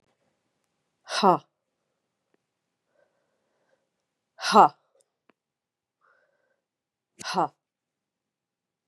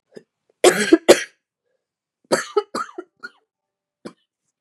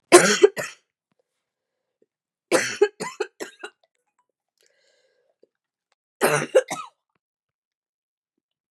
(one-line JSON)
{"exhalation_length": "8.9 s", "exhalation_amplitude": 25055, "exhalation_signal_mean_std_ratio": 0.18, "cough_length": "4.6 s", "cough_amplitude": 32768, "cough_signal_mean_std_ratio": 0.26, "three_cough_length": "8.7 s", "three_cough_amplitude": 32768, "three_cough_signal_mean_std_ratio": 0.24, "survey_phase": "beta (2021-08-13 to 2022-03-07)", "age": "18-44", "gender": "Female", "wearing_mask": "No", "symptom_cough_any": true, "symptom_new_continuous_cough": true, "symptom_runny_or_blocked_nose": true, "symptom_shortness_of_breath": true, "symptom_fatigue": true, "symptom_fever_high_temperature": true, "symptom_headache": true, "symptom_change_to_sense_of_smell_or_taste": true, "symptom_loss_of_taste": true, "symptom_onset": "5 days", "smoker_status": "Never smoked", "respiratory_condition_asthma": false, "respiratory_condition_other": false, "recruitment_source": "Test and Trace", "submission_delay": "2 days", "covid_test_result": "Positive", "covid_test_method": "RT-qPCR", "covid_ct_value": 16.7, "covid_ct_gene": "ORF1ab gene", "covid_ct_mean": 18.0, "covid_viral_load": "1300000 copies/ml", "covid_viral_load_category": "High viral load (>1M copies/ml)"}